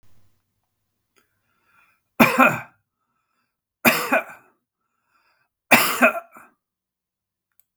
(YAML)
three_cough_length: 7.8 s
three_cough_amplitude: 32768
three_cough_signal_mean_std_ratio: 0.28
survey_phase: beta (2021-08-13 to 2022-03-07)
age: 65+
gender: Male
wearing_mask: 'No'
symptom_cough_any: true
symptom_runny_or_blocked_nose: true
smoker_status: Ex-smoker
respiratory_condition_asthma: false
respiratory_condition_other: false
recruitment_source: REACT
submission_delay: 1 day
covid_test_result: Negative
covid_test_method: RT-qPCR
influenza_a_test_result: Negative
influenza_b_test_result: Negative